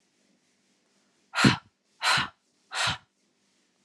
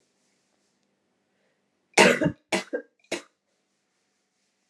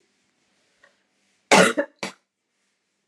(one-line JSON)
{"exhalation_length": "3.8 s", "exhalation_amplitude": 18087, "exhalation_signal_mean_std_ratio": 0.31, "three_cough_length": "4.7 s", "three_cough_amplitude": 31610, "three_cough_signal_mean_std_ratio": 0.23, "cough_length": "3.1 s", "cough_amplitude": 30938, "cough_signal_mean_std_ratio": 0.24, "survey_phase": "beta (2021-08-13 to 2022-03-07)", "age": "18-44", "gender": "Female", "wearing_mask": "No", "symptom_cough_any": true, "symptom_runny_or_blocked_nose": true, "symptom_sore_throat": true, "symptom_diarrhoea": true, "symptom_fever_high_temperature": true, "symptom_headache": true, "smoker_status": "Never smoked", "respiratory_condition_asthma": false, "respiratory_condition_other": false, "recruitment_source": "Test and Trace", "submission_delay": "1 day", "covid_test_result": "Positive", "covid_test_method": "RT-qPCR", "covid_ct_value": 22.3, "covid_ct_gene": "ORF1ab gene"}